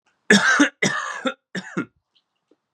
{"three_cough_length": "2.7 s", "three_cough_amplitude": 29733, "three_cough_signal_mean_std_ratio": 0.43, "survey_phase": "beta (2021-08-13 to 2022-03-07)", "age": "18-44", "gender": "Male", "wearing_mask": "No", "symptom_cough_any": true, "symptom_new_continuous_cough": true, "symptom_runny_or_blocked_nose": true, "symptom_sore_throat": true, "symptom_fatigue": true, "symptom_fever_high_temperature": true, "symptom_headache": true, "symptom_onset": "4 days", "smoker_status": "Never smoked", "respiratory_condition_asthma": false, "respiratory_condition_other": false, "recruitment_source": "Test and Trace", "submission_delay": "2 days", "covid_test_result": "Positive", "covid_test_method": "RT-qPCR", "covid_ct_value": 12.3, "covid_ct_gene": "N gene", "covid_ct_mean": 12.6, "covid_viral_load": "76000000 copies/ml", "covid_viral_load_category": "High viral load (>1M copies/ml)"}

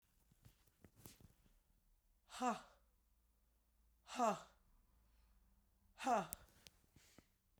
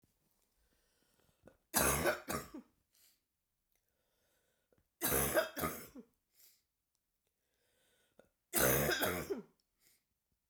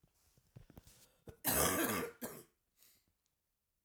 {"exhalation_length": "7.6 s", "exhalation_amplitude": 2421, "exhalation_signal_mean_std_ratio": 0.28, "three_cough_length": "10.5 s", "three_cough_amplitude": 5436, "three_cough_signal_mean_std_ratio": 0.36, "cough_length": "3.8 s", "cough_amplitude": 4171, "cough_signal_mean_std_ratio": 0.38, "survey_phase": "beta (2021-08-13 to 2022-03-07)", "age": "65+", "gender": "Female", "wearing_mask": "No", "symptom_cough_any": true, "symptom_runny_or_blocked_nose": true, "symptom_sore_throat": true, "symptom_diarrhoea": true, "symptom_fatigue": true, "symptom_loss_of_taste": true, "symptom_onset": "4 days", "smoker_status": "Never smoked", "respiratory_condition_asthma": false, "respiratory_condition_other": false, "recruitment_source": "Test and Trace", "submission_delay": "2 days", "covid_test_result": "Positive", "covid_test_method": "RT-qPCR", "covid_ct_value": 13.9, "covid_ct_gene": "ORF1ab gene", "covid_ct_mean": 14.1, "covid_viral_load": "23000000 copies/ml", "covid_viral_load_category": "High viral load (>1M copies/ml)"}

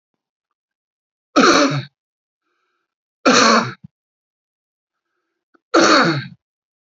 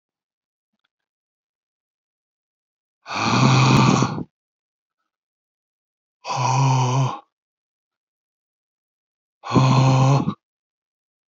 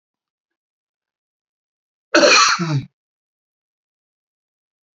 {"three_cough_length": "7.0 s", "three_cough_amplitude": 30596, "three_cough_signal_mean_std_ratio": 0.36, "exhalation_length": "11.3 s", "exhalation_amplitude": 25472, "exhalation_signal_mean_std_ratio": 0.41, "cough_length": "4.9 s", "cough_amplitude": 32689, "cough_signal_mean_std_ratio": 0.28, "survey_phase": "beta (2021-08-13 to 2022-03-07)", "age": "45-64", "gender": "Male", "wearing_mask": "No", "symptom_runny_or_blocked_nose": true, "smoker_status": "Never smoked", "respiratory_condition_asthma": false, "respiratory_condition_other": false, "recruitment_source": "REACT", "submission_delay": "2 days", "covid_test_result": "Negative", "covid_test_method": "RT-qPCR"}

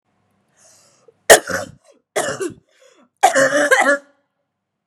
{"three_cough_length": "4.9 s", "three_cough_amplitude": 32768, "three_cough_signal_mean_std_ratio": 0.36, "survey_phase": "beta (2021-08-13 to 2022-03-07)", "age": "18-44", "gender": "Female", "wearing_mask": "No", "symptom_cough_any": true, "symptom_new_continuous_cough": true, "symptom_runny_or_blocked_nose": true, "symptom_fatigue": true, "symptom_headache": true, "symptom_onset": "4 days", "smoker_status": "Never smoked", "respiratory_condition_asthma": false, "respiratory_condition_other": false, "recruitment_source": "Test and Trace", "submission_delay": "3 days", "covid_test_result": "Positive", "covid_test_method": "RT-qPCR"}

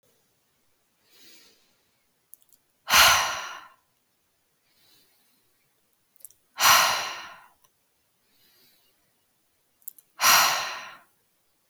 {"exhalation_length": "11.7 s", "exhalation_amplitude": 21457, "exhalation_signal_mean_std_ratio": 0.28, "survey_phase": "beta (2021-08-13 to 2022-03-07)", "age": "18-44", "gender": "Female", "wearing_mask": "No", "symptom_fatigue": true, "symptom_onset": "13 days", "smoker_status": "Never smoked", "respiratory_condition_asthma": false, "respiratory_condition_other": false, "recruitment_source": "REACT", "submission_delay": "0 days", "covid_test_result": "Negative", "covid_test_method": "RT-qPCR", "influenza_a_test_result": "Negative", "influenza_b_test_result": "Negative"}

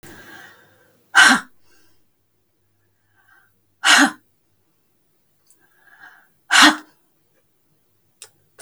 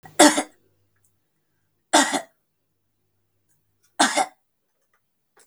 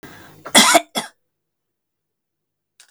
{"exhalation_length": "8.6 s", "exhalation_amplitude": 32768, "exhalation_signal_mean_std_ratio": 0.24, "three_cough_length": "5.5 s", "three_cough_amplitude": 32766, "three_cough_signal_mean_std_ratio": 0.25, "cough_length": "2.9 s", "cough_amplitude": 32768, "cough_signal_mean_std_ratio": 0.27, "survey_phase": "beta (2021-08-13 to 2022-03-07)", "age": "45-64", "gender": "Female", "wearing_mask": "No", "symptom_none": true, "smoker_status": "Never smoked", "respiratory_condition_asthma": false, "respiratory_condition_other": false, "recruitment_source": "REACT", "submission_delay": "1 day", "covid_test_result": "Negative", "covid_test_method": "RT-qPCR"}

